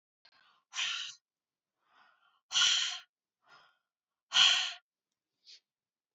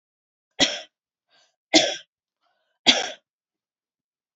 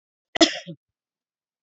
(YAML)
exhalation_length: 6.1 s
exhalation_amplitude: 8441
exhalation_signal_mean_std_ratio: 0.32
three_cough_length: 4.4 s
three_cough_amplitude: 27393
three_cough_signal_mean_std_ratio: 0.25
cough_length: 1.6 s
cough_amplitude: 28727
cough_signal_mean_std_ratio: 0.21
survey_phase: beta (2021-08-13 to 2022-03-07)
age: 45-64
gender: Female
wearing_mask: 'No'
symptom_runny_or_blocked_nose: true
symptom_sore_throat: true
symptom_fatigue: true
symptom_fever_high_temperature: true
symptom_headache: true
symptom_onset: 4 days
smoker_status: Never smoked
respiratory_condition_asthma: true
respiratory_condition_other: false
recruitment_source: Test and Trace
submission_delay: 1 day
covid_test_result: Positive
covid_test_method: RT-qPCR
covid_ct_value: 15.3
covid_ct_gene: N gene
covid_ct_mean: 16.1
covid_viral_load: 5400000 copies/ml
covid_viral_load_category: High viral load (>1M copies/ml)